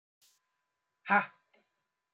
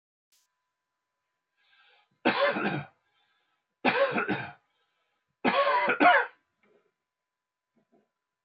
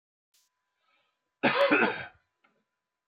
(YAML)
exhalation_length: 2.1 s
exhalation_amplitude: 7385
exhalation_signal_mean_std_ratio: 0.2
three_cough_length: 8.4 s
three_cough_amplitude: 13172
three_cough_signal_mean_std_ratio: 0.36
cough_length: 3.1 s
cough_amplitude: 9150
cough_signal_mean_std_ratio: 0.34
survey_phase: beta (2021-08-13 to 2022-03-07)
age: 45-64
gender: Male
wearing_mask: 'No'
symptom_cough_any: true
symptom_runny_or_blocked_nose: true
symptom_onset: 12 days
smoker_status: Never smoked
respiratory_condition_asthma: false
respiratory_condition_other: false
recruitment_source: REACT
submission_delay: 2 days
covid_test_result: Negative
covid_test_method: RT-qPCR